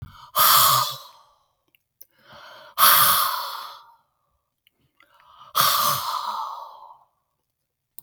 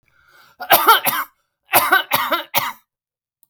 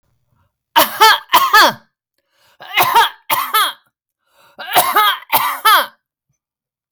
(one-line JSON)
{"exhalation_length": "8.0 s", "exhalation_amplitude": 29392, "exhalation_signal_mean_std_ratio": 0.42, "cough_length": "3.5 s", "cough_amplitude": 32768, "cough_signal_mean_std_ratio": 0.44, "three_cough_length": "6.9 s", "three_cough_amplitude": 32768, "three_cough_signal_mean_std_ratio": 0.48, "survey_phase": "beta (2021-08-13 to 2022-03-07)", "age": "65+", "gender": "Female", "wearing_mask": "No", "symptom_none": true, "smoker_status": "Ex-smoker", "respiratory_condition_asthma": false, "respiratory_condition_other": true, "recruitment_source": "REACT", "submission_delay": "2 days", "covid_test_result": "Negative", "covid_test_method": "RT-qPCR", "influenza_a_test_result": "Negative", "influenza_b_test_result": "Negative"}